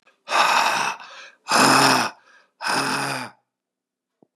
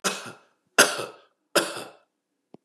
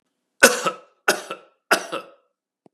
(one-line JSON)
{"exhalation_length": "4.4 s", "exhalation_amplitude": 27038, "exhalation_signal_mean_std_ratio": 0.55, "three_cough_length": "2.6 s", "three_cough_amplitude": 28069, "three_cough_signal_mean_std_ratio": 0.32, "cough_length": "2.7 s", "cough_amplitude": 32768, "cough_signal_mean_std_ratio": 0.3, "survey_phase": "beta (2021-08-13 to 2022-03-07)", "age": "65+", "gender": "Male", "wearing_mask": "No", "symptom_none": true, "smoker_status": "Ex-smoker", "respiratory_condition_asthma": false, "respiratory_condition_other": false, "recruitment_source": "REACT", "submission_delay": "1 day", "covid_test_result": "Negative", "covid_test_method": "RT-qPCR", "influenza_a_test_result": "Negative", "influenza_b_test_result": "Negative"}